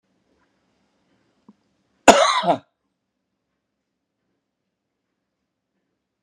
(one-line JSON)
{"cough_length": "6.2 s", "cough_amplitude": 32768, "cough_signal_mean_std_ratio": 0.18, "survey_phase": "beta (2021-08-13 to 2022-03-07)", "age": "45-64", "gender": "Male", "wearing_mask": "No", "symptom_none": true, "symptom_onset": "8 days", "smoker_status": "Never smoked", "respiratory_condition_asthma": false, "respiratory_condition_other": false, "recruitment_source": "REACT", "submission_delay": "1 day", "covid_test_result": "Negative", "covid_test_method": "RT-qPCR"}